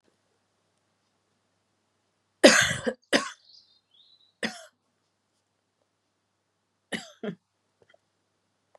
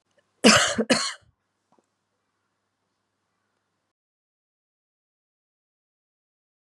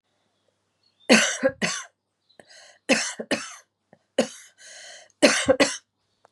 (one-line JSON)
{"cough_length": "8.8 s", "cough_amplitude": 28109, "cough_signal_mean_std_ratio": 0.19, "exhalation_length": "6.7 s", "exhalation_amplitude": 29770, "exhalation_signal_mean_std_ratio": 0.2, "three_cough_length": "6.3 s", "three_cough_amplitude": 29636, "three_cough_signal_mean_std_ratio": 0.35, "survey_phase": "beta (2021-08-13 to 2022-03-07)", "age": "45-64", "gender": "Female", "wearing_mask": "No", "symptom_cough_any": true, "symptom_runny_or_blocked_nose": true, "symptom_sore_throat": true, "symptom_fatigue": true, "symptom_headache": true, "symptom_onset": "2 days", "smoker_status": "Never smoked", "respiratory_condition_asthma": false, "respiratory_condition_other": true, "recruitment_source": "Test and Trace", "submission_delay": "1 day", "covid_test_result": "Positive", "covid_test_method": "ePCR"}